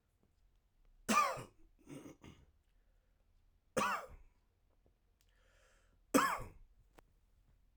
{"three_cough_length": "7.8 s", "three_cough_amplitude": 5145, "three_cough_signal_mean_std_ratio": 0.29, "survey_phase": "beta (2021-08-13 to 2022-03-07)", "age": "18-44", "gender": "Male", "wearing_mask": "No", "symptom_sore_throat": true, "smoker_status": "Ex-smoker", "respiratory_condition_asthma": false, "respiratory_condition_other": false, "recruitment_source": "Test and Trace", "submission_delay": "5 days", "covid_test_result": "Negative", "covid_test_method": "RT-qPCR"}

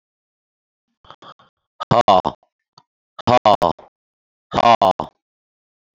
{"exhalation_length": "5.9 s", "exhalation_amplitude": 31256, "exhalation_signal_mean_std_ratio": 0.29, "survey_phase": "beta (2021-08-13 to 2022-03-07)", "age": "45-64", "gender": "Male", "wearing_mask": "No", "symptom_cough_any": true, "symptom_runny_or_blocked_nose": true, "smoker_status": "Ex-smoker", "respiratory_condition_asthma": false, "respiratory_condition_other": false, "recruitment_source": "Test and Trace", "submission_delay": "2 days", "covid_test_result": "Positive", "covid_test_method": "RT-qPCR", "covid_ct_value": 20.8, "covid_ct_gene": "N gene", "covid_ct_mean": 21.7, "covid_viral_load": "78000 copies/ml", "covid_viral_load_category": "Low viral load (10K-1M copies/ml)"}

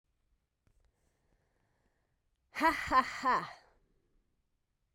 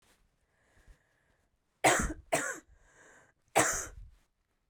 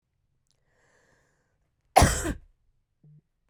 {"exhalation_length": "4.9 s", "exhalation_amplitude": 6340, "exhalation_signal_mean_std_ratio": 0.29, "three_cough_length": "4.7 s", "three_cough_amplitude": 9251, "three_cough_signal_mean_std_ratio": 0.32, "cough_length": "3.5 s", "cough_amplitude": 26741, "cough_signal_mean_std_ratio": 0.21, "survey_phase": "beta (2021-08-13 to 2022-03-07)", "age": "18-44", "gender": "Female", "wearing_mask": "No", "symptom_cough_any": true, "symptom_new_continuous_cough": true, "symptom_fever_high_temperature": true, "symptom_headache": true, "smoker_status": "Never smoked", "respiratory_condition_asthma": false, "respiratory_condition_other": false, "recruitment_source": "Test and Trace", "submission_delay": "1 day", "covid_test_result": "Positive", "covid_test_method": "RT-qPCR", "covid_ct_value": 30.0, "covid_ct_gene": "N gene"}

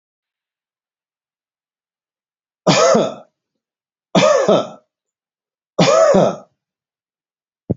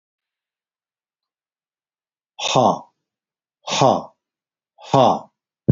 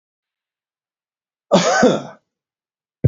{"three_cough_length": "7.8 s", "three_cough_amplitude": 32768, "three_cough_signal_mean_std_ratio": 0.37, "exhalation_length": "5.7 s", "exhalation_amplitude": 27697, "exhalation_signal_mean_std_ratio": 0.3, "cough_length": "3.1 s", "cough_amplitude": 28335, "cough_signal_mean_std_ratio": 0.32, "survey_phase": "beta (2021-08-13 to 2022-03-07)", "age": "65+", "gender": "Male", "wearing_mask": "No", "symptom_cough_any": true, "symptom_onset": "4 days", "smoker_status": "Never smoked", "respiratory_condition_asthma": false, "respiratory_condition_other": false, "recruitment_source": "REACT", "submission_delay": "1 day", "covid_test_result": "Negative", "covid_test_method": "RT-qPCR", "influenza_a_test_result": "Unknown/Void", "influenza_b_test_result": "Unknown/Void"}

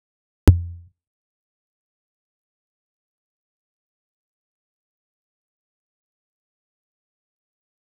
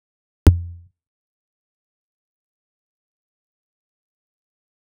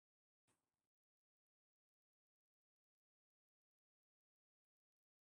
{"three_cough_length": "7.8 s", "three_cough_amplitude": 26028, "three_cough_signal_mean_std_ratio": 0.1, "exhalation_length": "4.8 s", "exhalation_amplitude": 26028, "exhalation_signal_mean_std_ratio": 0.12, "cough_length": "5.2 s", "cough_amplitude": 11, "cough_signal_mean_std_ratio": 0.12, "survey_phase": "beta (2021-08-13 to 2022-03-07)", "age": "45-64", "gender": "Female", "wearing_mask": "No", "symptom_fatigue": true, "smoker_status": "Never smoked", "respiratory_condition_asthma": false, "respiratory_condition_other": false, "recruitment_source": "REACT", "submission_delay": "6 days", "covid_test_result": "Negative", "covid_test_method": "RT-qPCR", "influenza_a_test_result": "Negative", "influenza_b_test_result": "Negative"}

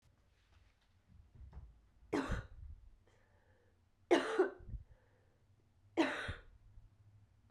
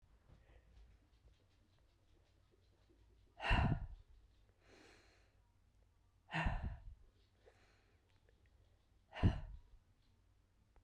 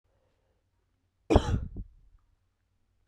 {"three_cough_length": "7.5 s", "three_cough_amplitude": 4533, "three_cough_signal_mean_std_ratio": 0.33, "exhalation_length": "10.8 s", "exhalation_amplitude": 2605, "exhalation_signal_mean_std_ratio": 0.29, "cough_length": "3.1 s", "cough_amplitude": 15980, "cough_signal_mean_std_ratio": 0.24, "survey_phase": "beta (2021-08-13 to 2022-03-07)", "age": "45-64", "gender": "Female", "wearing_mask": "No", "symptom_cough_any": true, "symptom_runny_or_blocked_nose": true, "symptom_shortness_of_breath": true, "symptom_sore_throat": true, "symptom_abdominal_pain": true, "symptom_fatigue": true, "symptom_headache": true, "symptom_other": true, "symptom_onset": "3 days", "smoker_status": "Ex-smoker", "respiratory_condition_asthma": false, "respiratory_condition_other": false, "recruitment_source": "Test and Trace", "submission_delay": "2 days", "covid_test_result": "Positive", "covid_test_method": "RT-qPCR", "covid_ct_value": 26.9, "covid_ct_gene": "N gene"}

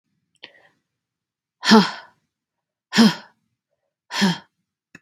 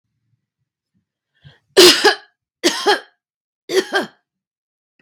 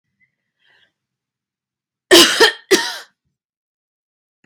{"exhalation_length": "5.0 s", "exhalation_amplitude": 32767, "exhalation_signal_mean_std_ratio": 0.28, "three_cough_length": "5.0 s", "three_cough_amplitude": 32768, "three_cough_signal_mean_std_ratio": 0.31, "cough_length": "4.5 s", "cough_amplitude": 32768, "cough_signal_mean_std_ratio": 0.27, "survey_phase": "beta (2021-08-13 to 2022-03-07)", "age": "45-64", "gender": "Female", "wearing_mask": "No", "symptom_fatigue": true, "symptom_change_to_sense_of_smell_or_taste": true, "symptom_loss_of_taste": true, "symptom_onset": "12 days", "smoker_status": "Ex-smoker", "respiratory_condition_asthma": false, "respiratory_condition_other": false, "recruitment_source": "REACT", "submission_delay": "1 day", "covid_test_result": "Negative", "covid_test_method": "RT-qPCR", "influenza_a_test_result": "Unknown/Void", "influenza_b_test_result": "Unknown/Void"}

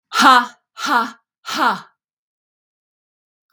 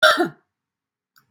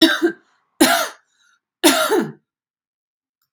{"exhalation_length": "3.5 s", "exhalation_amplitude": 32768, "exhalation_signal_mean_std_ratio": 0.36, "cough_length": "1.3 s", "cough_amplitude": 29380, "cough_signal_mean_std_ratio": 0.33, "three_cough_length": "3.5 s", "three_cough_amplitude": 32767, "three_cough_signal_mean_std_ratio": 0.41, "survey_phase": "beta (2021-08-13 to 2022-03-07)", "age": "65+", "gender": "Female", "wearing_mask": "No", "symptom_none": true, "symptom_onset": "11 days", "smoker_status": "Ex-smoker", "respiratory_condition_asthma": false, "respiratory_condition_other": false, "recruitment_source": "REACT", "submission_delay": "11 days", "covid_test_result": "Negative", "covid_test_method": "RT-qPCR", "influenza_a_test_result": "Unknown/Void", "influenza_b_test_result": "Unknown/Void"}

